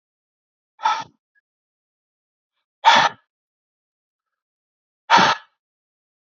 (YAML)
exhalation_length: 6.3 s
exhalation_amplitude: 30894
exhalation_signal_mean_std_ratio: 0.25
survey_phase: beta (2021-08-13 to 2022-03-07)
age: 45-64
gender: Male
wearing_mask: 'No'
symptom_cough_any: true
symptom_new_continuous_cough: true
symptom_runny_or_blocked_nose: true
symptom_change_to_sense_of_smell_or_taste: true
symptom_onset: 4 days
smoker_status: Never smoked
respiratory_condition_asthma: false
respiratory_condition_other: false
recruitment_source: Test and Trace
submission_delay: 2 days
covid_test_result: Positive
covid_test_method: ePCR